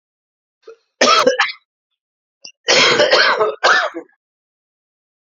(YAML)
cough_length: 5.4 s
cough_amplitude: 32767
cough_signal_mean_std_ratio: 0.46
survey_phase: alpha (2021-03-01 to 2021-08-12)
age: 45-64
gender: Male
wearing_mask: 'No'
symptom_new_continuous_cough: true
symptom_fatigue: true
symptom_headache: true
symptom_loss_of_taste: true
symptom_onset: 4 days
smoker_status: Never smoked
respiratory_condition_asthma: false
respiratory_condition_other: false
recruitment_source: Test and Trace
submission_delay: 1 day
covid_test_result: Positive
covid_test_method: RT-qPCR
covid_ct_value: 15.4
covid_ct_gene: ORF1ab gene
covid_ct_mean: 16.6
covid_viral_load: 3600000 copies/ml
covid_viral_load_category: High viral load (>1M copies/ml)